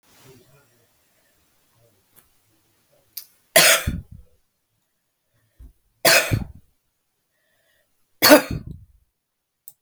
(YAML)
three_cough_length: 9.8 s
three_cough_amplitude: 32768
three_cough_signal_mean_std_ratio: 0.24
survey_phase: beta (2021-08-13 to 2022-03-07)
age: 65+
gender: Female
wearing_mask: 'No'
symptom_none: true
smoker_status: Never smoked
respiratory_condition_asthma: false
respiratory_condition_other: false
recruitment_source: REACT
submission_delay: 0 days
covid_test_result: Negative
covid_test_method: RT-qPCR